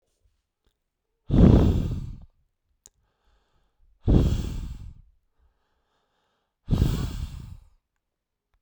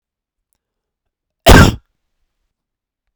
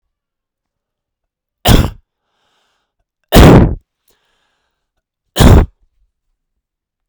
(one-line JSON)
{"exhalation_length": "8.6 s", "exhalation_amplitude": 25636, "exhalation_signal_mean_std_ratio": 0.34, "cough_length": "3.2 s", "cough_amplitude": 32768, "cough_signal_mean_std_ratio": 0.24, "three_cough_length": "7.1 s", "three_cough_amplitude": 32768, "three_cough_signal_mean_std_ratio": 0.31, "survey_phase": "beta (2021-08-13 to 2022-03-07)", "age": "18-44", "gender": "Male", "wearing_mask": "No", "symptom_none": true, "symptom_onset": "2 days", "smoker_status": "Never smoked", "respiratory_condition_asthma": false, "respiratory_condition_other": false, "recruitment_source": "REACT", "submission_delay": "2 days", "covid_test_result": "Negative", "covid_test_method": "RT-qPCR", "influenza_a_test_result": "Negative", "influenza_b_test_result": "Negative"}